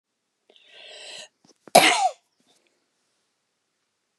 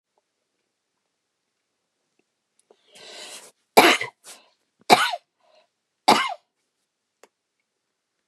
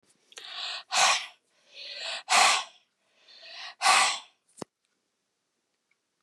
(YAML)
cough_length: 4.2 s
cough_amplitude: 32767
cough_signal_mean_std_ratio: 0.23
three_cough_length: 8.3 s
three_cough_amplitude: 32768
three_cough_signal_mean_std_ratio: 0.21
exhalation_length: 6.2 s
exhalation_amplitude: 12142
exhalation_signal_mean_std_ratio: 0.38
survey_phase: beta (2021-08-13 to 2022-03-07)
age: 65+
gender: Female
wearing_mask: 'No'
symptom_none: true
symptom_onset: 11 days
smoker_status: Never smoked
respiratory_condition_asthma: false
respiratory_condition_other: false
recruitment_source: REACT
submission_delay: 3 days
covid_test_result: Negative
covid_test_method: RT-qPCR
influenza_a_test_result: Negative
influenza_b_test_result: Negative